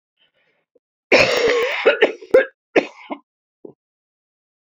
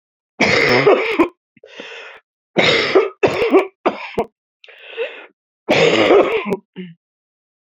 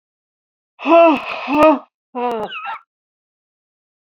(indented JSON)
{
  "cough_length": "4.6 s",
  "cough_amplitude": 30643,
  "cough_signal_mean_std_ratio": 0.39,
  "three_cough_length": "7.8 s",
  "three_cough_amplitude": 28990,
  "three_cough_signal_mean_std_ratio": 0.53,
  "exhalation_length": "4.1 s",
  "exhalation_amplitude": 27061,
  "exhalation_signal_mean_std_ratio": 0.41,
  "survey_phase": "beta (2021-08-13 to 2022-03-07)",
  "age": "65+",
  "gender": "Female",
  "wearing_mask": "Yes",
  "symptom_cough_any": true,
  "symptom_runny_or_blocked_nose": true,
  "symptom_fatigue": true,
  "symptom_headache": true,
  "symptom_other": true,
  "smoker_status": "Never smoked",
  "respiratory_condition_asthma": false,
  "respiratory_condition_other": true,
  "recruitment_source": "Test and Trace",
  "submission_delay": "3 days",
  "covid_test_result": "Positive",
  "covid_test_method": "RT-qPCR",
  "covid_ct_value": 20.7,
  "covid_ct_gene": "ORF1ab gene",
  "covid_ct_mean": 21.9,
  "covid_viral_load": "64000 copies/ml",
  "covid_viral_load_category": "Low viral load (10K-1M copies/ml)"
}